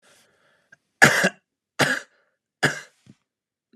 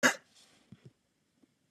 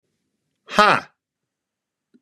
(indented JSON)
{
  "three_cough_length": "3.8 s",
  "three_cough_amplitude": 32768,
  "three_cough_signal_mean_std_ratio": 0.28,
  "cough_length": "1.7 s",
  "cough_amplitude": 10617,
  "cough_signal_mean_std_ratio": 0.2,
  "exhalation_length": "2.2 s",
  "exhalation_amplitude": 32767,
  "exhalation_signal_mean_std_ratio": 0.23,
  "survey_phase": "beta (2021-08-13 to 2022-03-07)",
  "age": "18-44",
  "gender": "Male",
  "wearing_mask": "No",
  "symptom_none": true,
  "smoker_status": "Never smoked",
  "respiratory_condition_asthma": false,
  "respiratory_condition_other": false,
  "recruitment_source": "REACT",
  "submission_delay": "2 days",
  "covid_test_result": "Negative",
  "covid_test_method": "RT-qPCR",
  "influenza_a_test_result": "Negative",
  "influenza_b_test_result": "Negative"
}